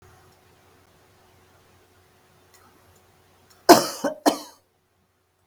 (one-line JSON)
{"cough_length": "5.5 s", "cough_amplitude": 32768, "cough_signal_mean_std_ratio": 0.18, "survey_phase": "beta (2021-08-13 to 2022-03-07)", "age": "65+", "gender": "Female", "wearing_mask": "No", "symptom_none": true, "smoker_status": "Never smoked", "respiratory_condition_asthma": false, "respiratory_condition_other": false, "recruitment_source": "REACT", "submission_delay": "2 days", "covid_test_result": "Negative", "covid_test_method": "RT-qPCR"}